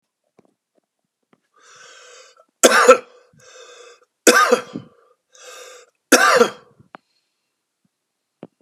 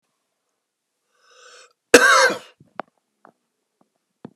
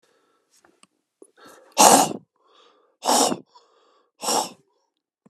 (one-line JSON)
{"three_cough_length": "8.6 s", "three_cough_amplitude": 32768, "three_cough_signal_mean_std_ratio": 0.28, "cough_length": "4.4 s", "cough_amplitude": 32768, "cough_signal_mean_std_ratio": 0.24, "exhalation_length": "5.3 s", "exhalation_amplitude": 32768, "exhalation_signal_mean_std_ratio": 0.3, "survey_phase": "beta (2021-08-13 to 2022-03-07)", "age": "65+", "gender": "Male", "wearing_mask": "No", "symptom_cough_any": true, "symptom_runny_or_blocked_nose": true, "symptom_sore_throat": true, "smoker_status": "Ex-smoker", "respiratory_condition_asthma": false, "respiratory_condition_other": false, "recruitment_source": "Test and Trace", "submission_delay": "29 days", "covid_test_result": "Negative", "covid_test_method": "LFT"}